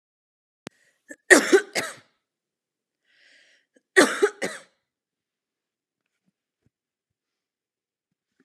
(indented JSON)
{
  "cough_length": "8.4 s",
  "cough_amplitude": 31971,
  "cough_signal_mean_std_ratio": 0.2,
  "survey_phase": "alpha (2021-03-01 to 2021-08-12)",
  "age": "45-64",
  "gender": "Female",
  "wearing_mask": "No",
  "symptom_fatigue": true,
  "smoker_status": "Never smoked",
  "respiratory_condition_asthma": true,
  "respiratory_condition_other": false,
  "recruitment_source": "REACT",
  "submission_delay": "2 days",
  "covid_test_result": "Negative",
  "covid_test_method": "RT-qPCR"
}